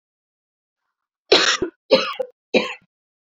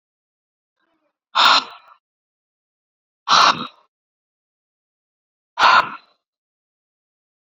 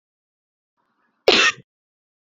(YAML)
three_cough_length: 3.3 s
three_cough_amplitude: 30686
three_cough_signal_mean_std_ratio: 0.34
exhalation_length: 7.5 s
exhalation_amplitude: 31005
exhalation_signal_mean_std_ratio: 0.27
cough_length: 2.2 s
cough_amplitude: 28359
cough_signal_mean_std_ratio: 0.25
survey_phase: beta (2021-08-13 to 2022-03-07)
age: 45-64
gender: Female
wearing_mask: 'No'
symptom_cough_any: true
symptom_runny_or_blocked_nose: true
symptom_fatigue: true
symptom_onset: 2 days
smoker_status: Never smoked
respiratory_condition_asthma: false
respiratory_condition_other: false
recruitment_source: Test and Trace
submission_delay: 2 days
covid_test_result: Positive
covid_test_method: RT-qPCR
covid_ct_value: 23.7
covid_ct_gene: ORF1ab gene
covid_ct_mean: 24.2
covid_viral_load: 12000 copies/ml
covid_viral_load_category: Low viral load (10K-1M copies/ml)